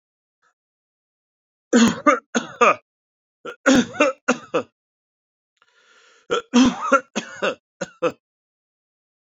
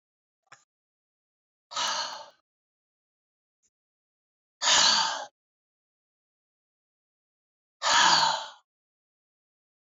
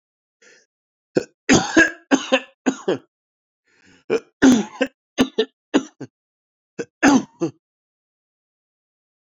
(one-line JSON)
{"three_cough_length": "9.3 s", "three_cough_amplitude": 26318, "three_cough_signal_mean_std_ratio": 0.35, "exhalation_length": "9.9 s", "exhalation_amplitude": 14392, "exhalation_signal_mean_std_ratio": 0.3, "cough_length": "9.2 s", "cough_amplitude": 30297, "cough_signal_mean_std_ratio": 0.32, "survey_phase": "alpha (2021-03-01 to 2021-08-12)", "age": "18-44", "gender": "Male", "wearing_mask": "No", "symptom_none": true, "symptom_cough_any": true, "symptom_onset": "6 days", "smoker_status": "Never smoked", "respiratory_condition_asthma": false, "respiratory_condition_other": false, "recruitment_source": "Test and Trace", "submission_delay": "3 days", "covid_test_result": "Positive", "covid_test_method": "RT-qPCR", "covid_ct_value": 19.6, "covid_ct_gene": "N gene", "covid_ct_mean": 20.0, "covid_viral_load": "270000 copies/ml", "covid_viral_load_category": "Low viral load (10K-1M copies/ml)"}